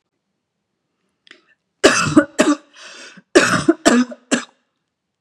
cough_length: 5.2 s
cough_amplitude: 32768
cough_signal_mean_std_ratio: 0.37
survey_phase: beta (2021-08-13 to 2022-03-07)
age: 45-64
gender: Female
wearing_mask: 'No'
symptom_sore_throat: true
symptom_fatigue: true
symptom_headache: true
symptom_onset: 3 days
smoker_status: Never smoked
respiratory_condition_asthma: false
respiratory_condition_other: false
recruitment_source: Test and Trace
submission_delay: 1 day
covid_test_result: Positive
covid_test_method: RT-qPCR
covid_ct_value: 28.2
covid_ct_gene: N gene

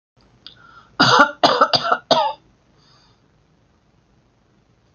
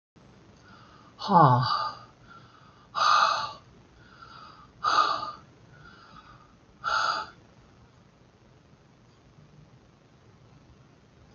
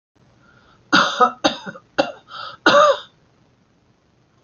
cough_length: 4.9 s
cough_amplitude: 32101
cough_signal_mean_std_ratio: 0.35
exhalation_length: 11.3 s
exhalation_amplitude: 15407
exhalation_signal_mean_std_ratio: 0.36
three_cough_length: 4.4 s
three_cough_amplitude: 28966
three_cough_signal_mean_std_ratio: 0.36
survey_phase: alpha (2021-03-01 to 2021-08-12)
age: 65+
gender: Female
wearing_mask: 'No'
symptom_shortness_of_breath: true
smoker_status: Never smoked
respiratory_condition_asthma: false
respiratory_condition_other: false
recruitment_source: REACT
submission_delay: 1 day
covid_test_result: Negative
covid_test_method: RT-qPCR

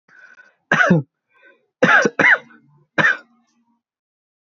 three_cough_length: 4.4 s
three_cough_amplitude: 26495
three_cough_signal_mean_std_ratio: 0.38
survey_phase: beta (2021-08-13 to 2022-03-07)
age: 18-44
gender: Male
wearing_mask: 'No'
symptom_none: true
smoker_status: Current smoker (e-cigarettes or vapes only)
respiratory_condition_asthma: false
respiratory_condition_other: false
recruitment_source: REACT
submission_delay: 1 day
covid_test_result: Negative
covid_test_method: RT-qPCR
influenza_a_test_result: Negative
influenza_b_test_result: Negative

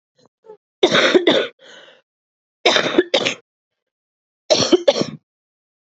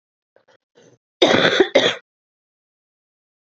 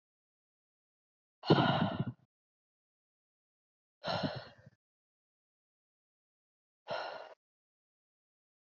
three_cough_length: 6.0 s
three_cough_amplitude: 31897
three_cough_signal_mean_std_ratio: 0.39
cough_length: 3.5 s
cough_amplitude: 32768
cough_signal_mean_std_ratio: 0.33
exhalation_length: 8.6 s
exhalation_amplitude: 6876
exhalation_signal_mean_std_ratio: 0.26
survey_phase: beta (2021-08-13 to 2022-03-07)
age: 18-44
gender: Female
wearing_mask: 'No'
symptom_cough_any: true
symptom_runny_or_blocked_nose: true
symptom_fatigue: true
symptom_headache: true
symptom_other: true
smoker_status: Ex-smoker
respiratory_condition_asthma: false
respiratory_condition_other: false
recruitment_source: Test and Trace
submission_delay: 1 day
covid_test_result: Positive
covid_test_method: RT-qPCR
covid_ct_value: 29.2
covid_ct_gene: N gene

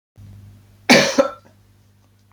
cough_length: 2.3 s
cough_amplitude: 29636
cough_signal_mean_std_ratio: 0.32
survey_phase: beta (2021-08-13 to 2022-03-07)
age: 45-64
gender: Male
wearing_mask: 'No'
symptom_sore_throat: true
symptom_onset: 12 days
smoker_status: Ex-smoker
respiratory_condition_asthma: false
respiratory_condition_other: false
recruitment_source: REACT
submission_delay: 5 days
covid_test_result: Negative
covid_test_method: RT-qPCR
influenza_a_test_result: Negative
influenza_b_test_result: Negative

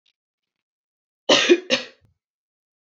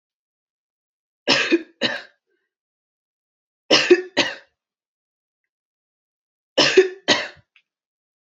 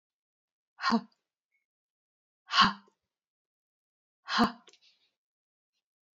cough_length: 2.9 s
cough_amplitude: 26001
cough_signal_mean_std_ratio: 0.28
three_cough_length: 8.4 s
three_cough_amplitude: 31447
three_cough_signal_mean_std_ratio: 0.29
exhalation_length: 6.1 s
exhalation_amplitude: 13120
exhalation_signal_mean_std_ratio: 0.23
survey_phase: beta (2021-08-13 to 2022-03-07)
age: 18-44
gender: Female
wearing_mask: 'No'
symptom_none: true
smoker_status: Ex-smoker
respiratory_condition_asthma: false
respiratory_condition_other: false
recruitment_source: REACT
submission_delay: 1 day
covid_test_result: Negative
covid_test_method: RT-qPCR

